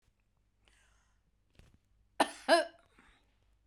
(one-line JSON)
{"cough_length": "3.7 s", "cough_amplitude": 7249, "cough_signal_mean_std_ratio": 0.21, "survey_phase": "beta (2021-08-13 to 2022-03-07)", "age": "45-64", "gender": "Female", "wearing_mask": "No", "symptom_none": true, "smoker_status": "Ex-smoker", "respiratory_condition_asthma": false, "respiratory_condition_other": false, "recruitment_source": "REACT", "submission_delay": "1 day", "covid_test_result": "Negative", "covid_test_method": "RT-qPCR"}